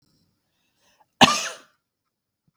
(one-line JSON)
{"cough_length": "2.6 s", "cough_amplitude": 32768, "cough_signal_mean_std_ratio": 0.2, "survey_phase": "beta (2021-08-13 to 2022-03-07)", "age": "45-64", "gender": "Female", "wearing_mask": "No", "symptom_none": true, "smoker_status": "Ex-smoker", "respiratory_condition_asthma": false, "respiratory_condition_other": false, "recruitment_source": "REACT", "submission_delay": "3 days", "covid_test_result": "Negative", "covid_test_method": "RT-qPCR", "influenza_a_test_result": "Unknown/Void", "influenza_b_test_result": "Unknown/Void"}